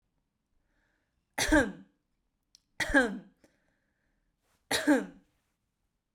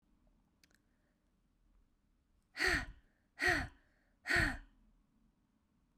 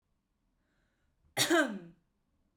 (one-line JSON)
{"three_cough_length": "6.1 s", "three_cough_amplitude": 8414, "three_cough_signal_mean_std_ratio": 0.3, "exhalation_length": "6.0 s", "exhalation_amplitude": 3482, "exhalation_signal_mean_std_ratio": 0.31, "cough_length": "2.6 s", "cough_amplitude": 6169, "cough_signal_mean_std_ratio": 0.31, "survey_phase": "beta (2021-08-13 to 2022-03-07)", "age": "18-44", "gender": "Female", "wearing_mask": "No", "symptom_none": true, "smoker_status": "Never smoked", "respiratory_condition_asthma": false, "respiratory_condition_other": false, "recruitment_source": "REACT", "submission_delay": "0 days", "covid_test_result": "Negative", "covid_test_method": "RT-qPCR", "influenza_a_test_result": "Negative", "influenza_b_test_result": "Negative"}